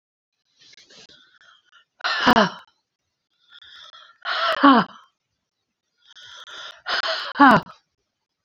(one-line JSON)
{"exhalation_length": "8.4 s", "exhalation_amplitude": 27615, "exhalation_signal_mean_std_ratio": 0.31, "survey_phase": "beta (2021-08-13 to 2022-03-07)", "age": "45-64", "gender": "Female", "wearing_mask": "No", "symptom_none": true, "smoker_status": "Never smoked", "respiratory_condition_asthma": false, "respiratory_condition_other": false, "recruitment_source": "REACT", "submission_delay": "1 day", "covid_test_result": "Negative", "covid_test_method": "RT-qPCR", "influenza_a_test_result": "Unknown/Void", "influenza_b_test_result": "Unknown/Void"}